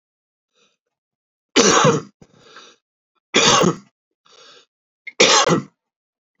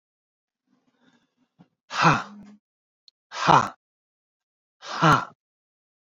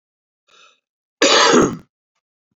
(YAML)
three_cough_length: 6.4 s
three_cough_amplitude: 32768
three_cough_signal_mean_std_ratio: 0.36
exhalation_length: 6.1 s
exhalation_amplitude: 27638
exhalation_signal_mean_std_ratio: 0.27
cough_length: 2.6 s
cough_amplitude: 32767
cough_signal_mean_std_ratio: 0.38
survey_phase: beta (2021-08-13 to 2022-03-07)
age: 45-64
gender: Male
wearing_mask: 'No'
symptom_none: true
smoker_status: Current smoker (11 or more cigarettes per day)
respiratory_condition_asthma: false
respiratory_condition_other: false
recruitment_source: REACT
submission_delay: 20 days
covid_test_result: Negative
covid_test_method: RT-qPCR